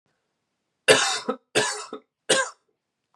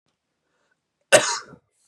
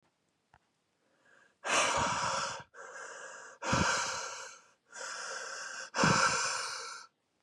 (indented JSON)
{
  "three_cough_length": "3.2 s",
  "three_cough_amplitude": 26521,
  "three_cough_signal_mean_std_ratio": 0.37,
  "cough_length": "1.9 s",
  "cough_amplitude": 32204,
  "cough_signal_mean_std_ratio": 0.23,
  "exhalation_length": "7.4 s",
  "exhalation_amplitude": 7300,
  "exhalation_signal_mean_std_ratio": 0.57,
  "survey_phase": "beta (2021-08-13 to 2022-03-07)",
  "age": "18-44",
  "gender": "Male",
  "wearing_mask": "No",
  "symptom_cough_any": true,
  "symptom_sore_throat": true,
  "symptom_other": true,
  "smoker_status": "Never smoked",
  "respiratory_condition_asthma": false,
  "respiratory_condition_other": false,
  "recruitment_source": "Test and Trace",
  "submission_delay": "1 day",
  "covid_test_result": "Positive",
  "covid_test_method": "RT-qPCR"
}